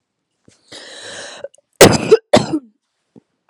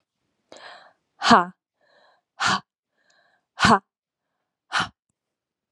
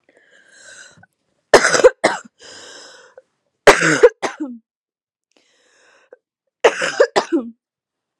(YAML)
cough_length: 3.5 s
cough_amplitude: 32768
cough_signal_mean_std_ratio: 0.29
exhalation_length: 5.7 s
exhalation_amplitude: 29736
exhalation_signal_mean_std_ratio: 0.25
three_cough_length: 8.2 s
three_cough_amplitude: 32768
three_cough_signal_mean_std_ratio: 0.3
survey_phase: beta (2021-08-13 to 2022-03-07)
age: 18-44
gender: Female
wearing_mask: 'No'
symptom_cough_any: true
symptom_runny_or_blocked_nose: true
symptom_sore_throat: true
symptom_fatigue: true
symptom_onset: 8 days
smoker_status: Current smoker (e-cigarettes or vapes only)
respiratory_condition_asthma: false
respiratory_condition_other: false
recruitment_source: REACT
submission_delay: 32 days
covid_test_result: Negative
covid_test_method: RT-qPCR